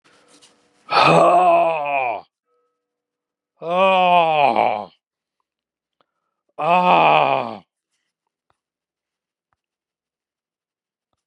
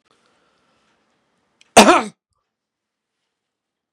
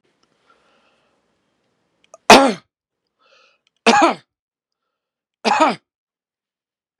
{"exhalation_length": "11.3 s", "exhalation_amplitude": 32064, "exhalation_signal_mean_std_ratio": 0.42, "cough_length": "3.9 s", "cough_amplitude": 32768, "cough_signal_mean_std_ratio": 0.19, "three_cough_length": "7.0 s", "three_cough_amplitude": 32768, "three_cough_signal_mean_std_ratio": 0.24, "survey_phase": "beta (2021-08-13 to 2022-03-07)", "age": "65+", "gender": "Male", "wearing_mask": "No", "symptom_sore_throat": true, "smoker_status": "Ex-smoker", "respiratory_condition_asthma": false, "respiratory_condition_other": false, "recruitment_source": "Test and Trace", "submission_delay": "2 days", "covid_test_result": "Positive", "covid_test_method": "RT-qPCR", "covid_ct_value": 25.8, "covid_ct_gene": "S gene"}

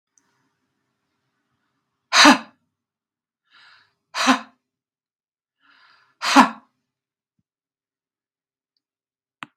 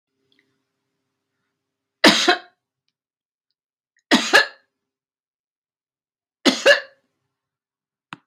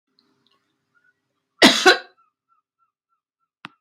{"exhalation_length": "9.6 s", "exhalation_amplitude": 32768, "exhalation_signal_mean_std_ratio": 0.19, "three_cough_length": "8.3 s", "three_cough_amplitude": 32768, "three_cough_signal_mean_std_ratio": 0.23, "cough_length": "3.8 s", "cough_amplitude": 32768, "cough_signal_mean_std_ratio": 0.21, "survey_phase": "beta (2021-08-13 to 2022-03-07)", "age": "45-64", "gender": "Female", "wearing_mask": "No", "symptom_none": true, "smoker_status": "Never smoked", "respiratory_condition_asthma": false, "respiratory_condition_other": false, "recruitment_source": "REACT", "submission_delay": "2 days", "covid_test_result": "Negative", "covid_test_method": "RT-qPCR", "influenza_a_test_result": "Negative", "influenza_b_test_result": "Negative"}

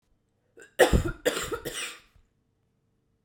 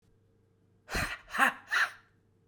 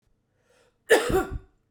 {"three_cough_length": "3.2 s", "three_cough_amplitude": 21573, "three_cough_signal_mean_std_ratio": 0.33, "exhalation_length": "2.5 s", "exhalation_amplitude": 9922, "exhalation_signal_mean_std_ratio": 0.39, "cough_length": "1.7 s", "cough_amplitude": 18546, "cough_signal_mean_std_ratio": 0.36, "survey_phase": "beta (2021-08-13 to 2022-03-07)", "age": "18-44", "gender": "Female", "wearing_mask": "No", "symptom_new_continuous_cough": true, "symptom_runny_or_blocked_nose": true, "symptom_diarrhoea": true, "symptom_change_to_sense_of_smell_or_taste": true, "symptom_loss_of_taste": true, "symptom_onset": "4 days", "smoker_status": "Never smoked", "respiratory_condition_asthma": false, "respiratory_condition_other": false, "recruitment_source": "Test and Trace", "submission_delay": "1 day", "covid_test_result": "Positive", "covid_test_method": "RT-qPCR", "covid_ct_value": 20.9, "covid_ct_gene": "ORF1ab gene"}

